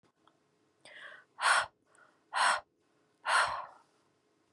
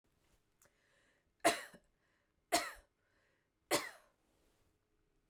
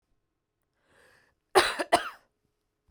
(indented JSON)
{
  "exhalation_length": "4.5 s",
  "exhalation_amplitude": 6935,
  "exhalation_signal_mean_std_ratio": 0.36,
  "three_cough_length": "5.3 s",
  "three_cough_amplitude": 4665,
  "three_cough_signal_mean_std_ratio": 0.22,
  "cough_length": "2.9 s",
  "cough_amplitude": 19061,
  "cough_signal_mean_std_ratio": 0.24,
  "survey_phase": "beta (2021-08-13 to 2022-03-07)",
  "age": "18-44",
  "gender": "Female",
  "wearing_mask": "No",
  "symptom_none": true,
  "smoker_status": "Ex-smoker",
  "respiratory_condition_asthma": false,
  "respiratory_condition_other": false,
  "recruitment_source": "REACT",
  "submission_delay": "1 day",
  "covid_test_result": "Negative",
  "covid_test_method": "RT-qPCR",
  "influenza_a_test_result": "Negative",
  "influenza_b_test_result": "Negative"
}